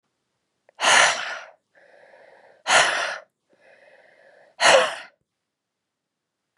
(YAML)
exhalation_length: 6.6 s
exhalation_amplitude: 25759
exhalation_signal_mean_std_ratio: 0.34
survey_phase: beta (2021-08-13 to 2022-03-07)
age: 18-44
gender: Female
wearing_mask: 'Yes'
symptom_cough_any: true
symptom_runny_or_blocked_nose: true
symptom_diarrhoea: true
symptom_headache: true
symptom_change_to_sense_of_smell_or_taste: true
smoker_status: Never smoked
respiratory_condition_asthma: false
respiratory_condition_other: false
recruitment_source: Test and Trace
submission_delay: 1 day
covid_test_result: Positive
covid_test_method: RT-qPCR